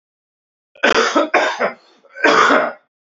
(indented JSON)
{
  "three_cough_length": "3.2 s",
  "three_cough_amplitude": 28417,
  "three_cough_signal_mean_std_ratio": 0.53,
  "survey_phase": "beta (2021-08-13 to 2022-03-07)",
  "age": "18-44",
  "gender": "Male",
  "wearing_mask": "No",
  "symptom_cough_any": true,
  "symptom_new_continuous_cough": true,
  "symptom_runny_or_blocked_nose": true,
  "symptom_sore_throat": true,
  "symptom_diarrhoea": true,
  "symptom_fatigue": true,
  "symptom_headache": true,
  "symptom_change_to_sense_of_smell_or_taste": true,
  "symptom_loss_of_taste": true,
  "symptom_onset": "2 days",
  "smoker_status": "Never smoked",
  "respiratory_condition_asthma": false,
  "respiratory_condition_other": false,
  "recruitment_source": "Test and Trace",
  "submission_delay": "1 day",
  "covid_test_result": "Positive",
  "covid_test_method": "RT-qPCR",
  "covid_ct_value": 20.8,
  "covid_ct_gene": "ORF1ab gene",
  "covid_ct_mean": 21.3,
  "covid_viral_load": "100000 copies/ml",
  "covid_viral_load_category": "Low viral load (10K-1M copies/ml)"
}